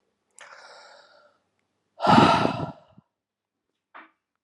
{
  "exhalation_length": "4.4 s",
  "exhalation_amplitude": 26583,
  "exhalation_signal_mean_std_ratio": 0.29,
  "survey_phase": "beta (2021-08-13 to 2022-03-07)",
  "age": "45-64",
  "gender": "Male",
  "wearing_mask": "No",
  "symptom_cough_any": true,
  "symptom_runny_or_blocked_nose": true,
  "symptom_fatigue": true,
  "symptom_onset": "2 days",
  "smoker_status": "Ex-smoker",
  "respiratory_condition_asthma": true,
  "respiratory_condition_other": false,
  "recruitment_source": "Test and Trace",
  "submission_delay": "1 day",
  "covid_test_result": "Positive",
  "covid_test_method": "RT-qPCR",
  "covid_ct_value": 19.0,
  "covid_ct_gene": "ORF1ab gene",
  "covid_ct_mean": 19.2,
  "covid_viral_load": "500000 copies/ml",
  "covid_viral_load_category": "Low viral load (10K-1M copies/ml)"
}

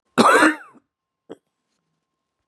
{
  "cough_length": "2.5 s",
  "cough_amplitude": 32301,
  "cough_signal_mean_std_ratio": 0.31,
  "survey_phase": "beta (2021-08-13 to 2022-03-07)",
  "age": "65+",
  "gender": "Female",
  "wearing_mask": "No",
  "symptom_cough_any": true,
  "symptom_runny_or_blocked_nose": true,
  "symptom_shortness_of_breath": true,
  "symptom_sore_throat": true,
  "symptom_diarrhoea": true,
  "symptom_fatigue": true,
  "symptom_headache": true,
  "symptom_other": true,
  "smoker_status": "Ex-smoker",
  "respiratory_condition_asthma": false,
  "respiratory_condition_other": false,
  "recruitment_source": "Test and Trace",
  "submission_delay": "1 day",
  "covid_test_result": "Positive",
  "covid_test_method": "LFT"
}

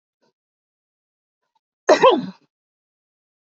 {
  "cough_length": "3.5 s",
  "cough_amplitude": 27321,
  "cough_signal_mean_std_ratio": 0.23,
  "survey_phase": "beta (2021-08-13 to 2022-03-07)",
  "age": "45-64",
  "gender": "Female",
  "wearing_mask": "No",
  "symptom_none": true,
  "smoker_status": "Ex-smoker",
  "respiratory_condition_asthma": false,
  "respiratory_condition_other": false,
  "recruitment_source": "REACT",
  "submission_delay": "0 days",
  "covid_test_result": "Negative",
  "covid_test_method": "RT-qPCR",
  "influenza_a_test_result": "Negative",
  "influenza_b_test_result": "Negative"
}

